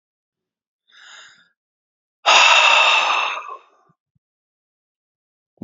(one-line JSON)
{"exhalation_length": "5.6 s", "exhalation_amplitude": 31301, "exhalation_signal_mean_std_ratio": 0.37, "survey_phase": "beta (2021-08-13 to 2022-03-07)", "age": "45-64", "gender": "Male", "wearing_mask": "Yes", "symptom_none": true, "smoker_status": "Never smoked", "respiratory_condition_asthma": false, "respiratory_condition_other": false, "recruitment_source": "Test and Trace", "submission_delay": "1 day", "covid_test_result": "Positive", "covid_test_method": "RT-qPCR"}